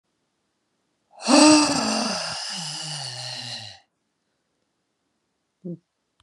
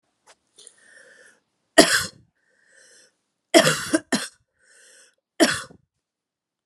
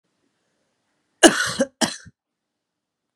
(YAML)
exhalation_length: 6.2 s
exhalation_amplitude: 25365
exhalation_signal_mean_std_ratio: 0.37
three_cough_length: 6.7 s
three_cough_amplitude: 32768
three_cough_signal_mean_std_ratio: 0.26
cough_length: 3.2 s
cough_amplitude: 32768
cough_signal_mean_std_ratio: 0.24
survey_phase: beta (2021-08-13 to 2022-03-07)
age: 45-64
gender: Female
wearing_mask: 'No'
symptom_cough_any: true
symptom_runny_or_blocked_nose: true
symptom_shortness_of_breath: true
symptom_diarrhoea: true
symptom_fatigue: true
symptom_onset: 4 days
smoker_status: Never smoked
respiratory_condition_asthma: false
respiratory_condition_other: false
recruitment_source: Test and Trace
submission_delay: 1 day
covid_test_result: Positive
covid_test_method: RT-qPCR
covid_ct_value: 20.9
covid_ct_gene: ORF1ab gene